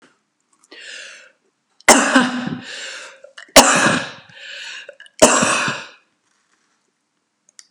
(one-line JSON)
{"three_cough_length": "7.7 s", "three_cough_amplitude": 32768, "three_cough_signal_mean_std_ratio": 0.37, "survey_phase": "beta (2021-08-13 to 2022-03-07)", "age": "65+", "gender": "Female", "wearing_mask": "No", "symptom_none": true, "smoker_status": "Never smoked", "respiratory_condition_asthma": true, "respiratory_condition_other": false, "recruitment_source": "REACT", "submission_delay": "2 days", "covid_test_result": "Negative", "covid_test_method": "RT-qPCR", "influenza_a_test_result": "Negative", "influenza_b_test_result": "Negative"}